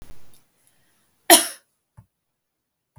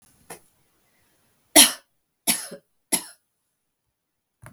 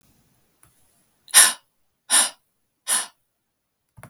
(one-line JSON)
{"cough_length": "3.0 s", "cough_amplitude": 32768, "cough_signal_mean_std_ratio": 0.19, "three_cough_length": "4.5 s", "three_cough_amplitude": 32768, "three_cough_signal_mean_std_ratio": 0.19, "exhalation_length": "4.1 s", "exhalation_amplitude": 32768, "exhalation_signal_mean_std_ratio": 0.26, "survey_phase": "beta (2021-08-13 to 2022-03-07)", "age": "45-64", "gender": "Female", "wearing_mask": "No", "symptom_none": true, "smoker_status": "Never smoked", "respiratory_condition_asthma": false, "respiratory_condition_other": false, "recruitment_source": "REACT", "submission_delay": "1 day", "covid_test_result": "Negative", "covid_test_method": "RT-qPCR", "influenza_a_test_result": "Negative", "influenza_b_test_result": "Negative"}